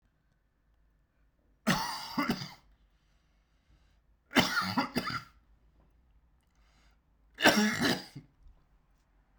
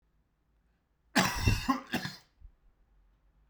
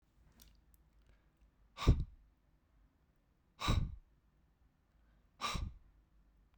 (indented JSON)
{
  "three_cough_length": "9.4 s",
  "three_cough_amplitude": 12609,
  "three_cough_signal_mean_std_ratio": 0.35,
  "cough_length": "3.5 s",
  "cough_amplitude": 9585,
  "cough_signal_mean_std_ratio": 0.36,
  "exhalation_length": "6.6 s",
  "exhalation_amplitude": 4960,
  "exhalation_signal_mean_std_ratio": 0.26,
  "survey_phase": "beta (2021-08-13 to 2022-03-07)",
  "age": "18-44",
  "gender": "Male",
  "wearing_mask": "No",
  "symptom_none": true,
  "symptom_onset": "8 days",
  "smoker_status": "Never smoked",
  "respiratory_condition_asthma": false,
  "respiratory_condition_other": false,
  "recruitment_source": "REACT",
  "submission_delay": "5 days",
  "covid_test_result": "Negative",
  "covid_test_method": "RT-qPCR",
  "influenza_a_test_result": "Unknown/Void",
  "influenza_b_test_result": "Unknown/Void"
}